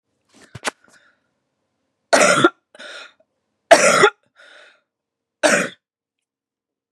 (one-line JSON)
{"three_cough_length": "6.9 s", "three_cough_amplitude": 32768, "three_cough_signal_mean_std_ratio": 0.3, "survey_phase": "beta (2021-08-13 to 2022-03-07)", "age": "45-64", "gender": "Female", "wearing_mask": "No", "symptom_cough_any": true, "symptom_new_continuous_cough": true, "symptom_runny_or_blocked_nose": true, "symptom_sore_throat": true, "symptom_fatigue": true, "symptom_headache": true, "symptom_onset": "3 days", "smoker_status": "Ex-smoker", "respiratory_condition_asthma": false, "respiratory_condition_other": false, "recruitment_source": "Test and Trace", "submission_delay": "2 days", "covid_test_result": "Negative", "covid_test_method": "RT-qPCR"}